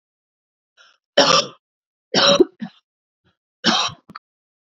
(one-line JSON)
{"three_cough_length": "4.6 s", "three_cough_amplitude": 28161, "three_cough_signal_mean_std_ratio": 0.33, "survey_phase": "beta (2021-08-13 to 2022-03-07)", "age": "18-44", "gender": "Female", "wearing_mask": "No", "symptom_cough_any": true, "symptom_shortness_of_breath": true, "symptom_sore_throat": true, "symptom_fatigue": true, "symptom_headache": true, "symptom_onset": "8 days", "smoker_status": "Ex-smoker", "respiratory_condition_asthma": true, "respiratory_condition_other": false, "recruitment_source": "Test and Trace", "submission_delay": "3 days", "covid_test_result": "Positive", "covid_test_method": "ePCR"}